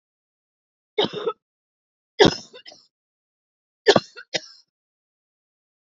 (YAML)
three_cough_length: 6.0 s
three_cough_amplitude: 28572
three_cough_signal_mean_std_ratio: 0.2
survey_phase: beta (2021-08-13 to 2022-03-07)
age: 45-64
gender: Female
wearing_mask: 'No'
symptom_cough_any: true
symptom_runny_or_blocked_nose: true
symptom_sore_throat: true
symptom_fatigue: true
symptom_onset: 2 days
smoker_status: Never smoked
respiratory_condition_asthma: false
respiratory_condition_other: false
recruitment_source: Test and Trace
submission_delay: 0 days
covid_test_result: Positive
covid_test_method: ePCR